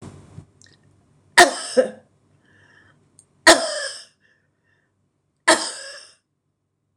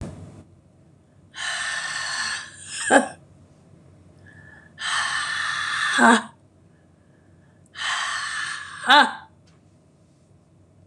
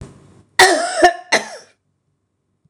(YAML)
three_cough_length: 7.0 s
three_cough_amplitude: 26028
three_cough_signal_mean_std_ratio: 0.25
exhalation_length: 10.9 s
exhalation_amplitude: 26028
exhalation_signal_mean_std_ratio: 0.42
cough_length: 2.7 s
cough_amplitude: 26028
cough_signal_mean_std_ratio: 0.37
survey_phase: beta (2021-08-13 to 2022-03-07)
age: 65+
gender: Female
wearing_mask: 'No'
symptom_runny_or_blocked_nose: true
symptom_fatigue: true
symptom_change_to_sense_of_smell_or_taste: true
symptom_loss_of_taste: true
symptom_other: true
symptom_onset: 3 days
smoker_status: Ex-smoker
respiratory_condition_asthma: false
respiratory_condition_other: false
recruitment_source: Test and Trace
submission_delay: 2 days
covid_test_result: Positive
covid_test_method: RT-qPCR
covid_ct_value: 25.8
covid_ct_gene: N gene
covid_ct_mean: 26.2
covid_viral_load: 2500 copies/ml
covid_viral_load_category: Minimal viral load (< 10K copies/ml)